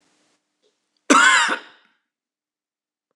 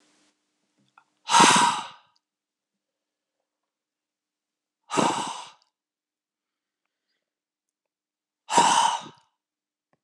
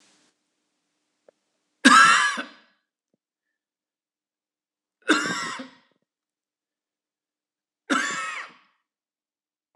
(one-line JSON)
{"cough_length": "3.2 s", "cough_amplitude": 26002, "cough_signal_mean_std_ratio": 0.31, "exhalation_length": "10.0 s", "exhalation_amplitude": 23613, "exhalation_signal_mean_std_ratio": 0.28, "three_cough_length": "9.8 s", "three_cough_amplitude": 26028, "three_cough_signal_mean_std_ratio": 0.26, "survey_phase": "beta (2021-08-13 to 2022-03-07)", "age": "45-64", "gender": "Male", "wearing_mask": "No", "symptom_none": true, "smoker_status": "Never smoked", "respiratory_condition_asthma": false, "respiratory_condition_other": false, "recruitment_source": "REACT", "submission_delay": "2 days", "covid_test_result": "Negative", "covid_test_method": "RT-qPCR"}